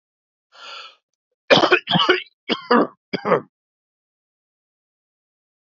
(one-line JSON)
{"cough_length": "5.7 s", "cough_amplitude": 32668, "cough_signal_mean_std_ratio": 0.32, "survey_phase": "beta (2021-08-13 to 2022-03-07)", "age": "45-64", "gender": "Male", "wearing_mask": "No", "symptom_cough_any": true, "symptom_runny_or_blocked_nose": true, "symptom_sore_throat": true, "symptom_diarrhoea": true, "symptom_fatigue": true, "symptom_fever_high_temperature": true, "symptom_headache": true, "symptom_loss_of_taste": true, "symptom_onset": "3 days", "smoker_status": "Never smoked", "respiratory_condition_asthma": false, "respiratory_condition_other": false, "recruitment_source": "Test and Trace", "submission_delay": "2 days", "covid_test_result": "Positive", "covid_test_method": "RT-qPCR"}